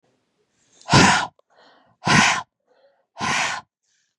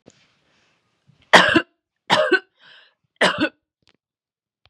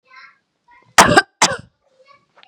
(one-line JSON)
{"exhalation_length": "4.2 s", "exhalation_amplitude": 30042, "exhalation_signal_mean_std_ratio": 0.39, "three_cough_length": "4.7 s", "three_cough_amplitude": 32768, "three_cough_signal_mean_std_ratio": 0.3, "cough_length": "2.5 s", "cough_amplitude": 32768, "cough_signal_mean_std_ratio": 0.28, "survey_phase": "beta (2021-08-13 to 2022-03-07)", "age": "18-44", "gender": "Female", "wearing_mask": "No", "symptom_none": true, "smoker_status": "Never smoked", "respiratory_condition_asthma": false, "respiratory_condition_other": false, "recruitment_source": "REACT", "submission_delay": "4 days", "covid_test_result": "Negative", "covid_test_method": "RT-qPCR", "influenza_a_test_result": "Negative", "influenza_b_test_result": "Negative"}